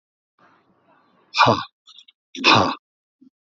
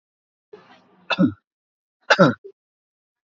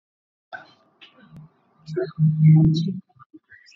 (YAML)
exhalation_length: 3.4 s
exhalation_amplitude: 27658
exhalation_signal_mean_std_ratio: 0.32
three_cough_length: 3.2 s
three_cough_amplitude: 26443
three_cough_signal_mean_std_ratio: 0.26
cough_length: 3.8 s
cough_amplitude: 15858
cough_signal_mean_std_ratio: 0.42
survey_phase: beta (2021-08-13 to 2022-03-07)
age: 65+
gender: Male
wearing_mask: 'No'
symptom_none: true
smoker_status: Ex-smoker
respiratory_condition_asthma: false
respiratory_condition_other: false
recruitment_source: REACT
submission_delay: 1 day
covid_test_result: Negative
covid_test_method: RT-qPCR
influenza_a_test_result: Negative
influenza_b_test_result: Negative